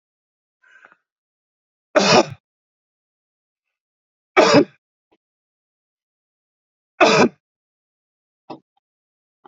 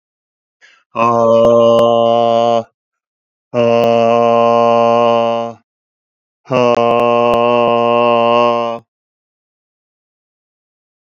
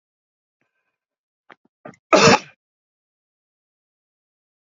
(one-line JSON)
{"three_cough_length": "9.5 s", "three_cough_amplitude": 29065, "three_cough_signal_mean_std_ratio": 0.24, "exhalation_length": "11.1 s", "exhalation_amplitude": 31574, "exhalation_signal_mean_std_ratio": 0.64, "cough_length": "4.8 s", "cough_amplitude": 30499, "cough_signal_mean_std_ratio": 0.18, "survey_phase": "alpha (2021-03-01 to 2021-08-12)", "age": "45-64", "gender": "Male", "wearing_mask": "No", "symptom_none": true, "smoker_status": "Ex-smoker", "respiratory_condition_asthma": false, "respiratory_condition_other": false, "recruitment_source": "REACT", "submission_delay": "1 day", "covid_test_result": "Negative", "covid_test_method": "RT-qPCR"}